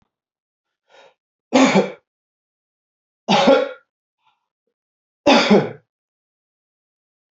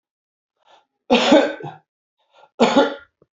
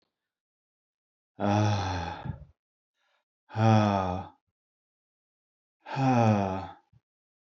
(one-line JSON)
{"three_cough_length": "7.3 s", "three_cough_amplitude": 28817, "three_cough_signal_mean_std_ratio": 0.31, "cough_length": "3.3 s", "cough_amplitude": 27899, "cough_signal_mean_std_ratio": 0.37, "exhalation_length": "7.4 s", "exhalation_amplitude": 11143, "exhalation_signal_mean_std_ratio": 0.43, "survey_phase": "beta (2021-08-13 to 2022-03-07)", "age": "45-64", "gender": "Male", "wearing_mask": "No", "symptom_runny_or_blocked_nose": true, "symptom_fatigue": true, "symptom_change_to_sense_of_smell_or_taste": true, "symptom_loss_of_taste": true, "smoker_status": "Ex-smoker", "respiratory_condition_asthma": false, "respiratory_condition_other": false, "recruitment_source": "REACT", "submission_delay": "1 day", "covid_test_result": "Negative", "covid_test_method": "RT-qPCR"}